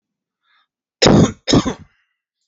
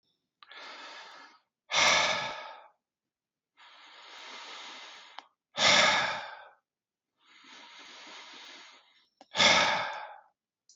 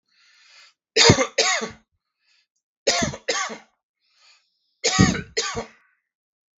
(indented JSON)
{
  "cough_length": "2.5 s",
  "cough_amplitude": 32768,
  "cough_signal_mean_std_ratio": 0.36,
  "exhalation_length": "10.8 s",
  "exhalation_amplitude": 12312,
  "exhalation_signal_mean_std_ratio": 0.38,
  "three_cough_length": "6.6 s",
  "three_cough_amplitude": 32768,
  "three_cough_signal_mean_std_ratio": 0.36,
  "survey_phase": "beta (2021-08-13 to 2022-03-07)",
  "age": "45-64",
  "gender": "Male",
  "wearing_mask": "No",
  "symptom_fatigue": true,
  "symptom_headache": true,
  "smoker_status": "Never smoked",
  "respiratory_condition_asthma": false,
  "respiratory_condition_other": false,
  "recruitment_source": "REACT",
  "submission_delay": "8 days",
  "covid_test_result": "Negative",
  "covid_test_method": "RT-qPCR"
}